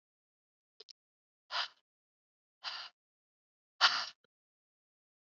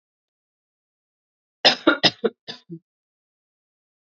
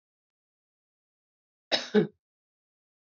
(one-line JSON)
{"exhalation_length": "5.3 s", "exhalation_amplitude": 9197, "exhalation_signal_mean_std_ratio": 0.2, "three_cough_length": "4.1 s", "three_cough_amplitude": 30531, "three_cough_signal_mean_std_ratio": 0.21, "cough_length": "3.2 s", "cough_amplitude": 9724, "cough_signal_mean_std_ratio": 0.2, "survey_phase": "beta (2021-08-13 to 2022-03-07)", "age": "18-44", "gender": "Female", "wearing_mask": "No", "symptom_cough_any": true, "symptom_runny_or_blocked_nose": true, "symptom_shortness_of_breath": true, "symptom_sore_throat": true, "symptom_other": true, "symptom_onset": "4 days", "smoker_status": "Ex-smoker", "respiratory_condition_asthma": false, "respiratory_condition_other": false, "recruitment_source": "Test and Trace", "submission_delay": "1 day", "covid_test_result": "Positive", "covid_test_method": "RT-qPCR", "covid_ct_value": 15.3, "covid_ct_gene": "ORF1ab gene"}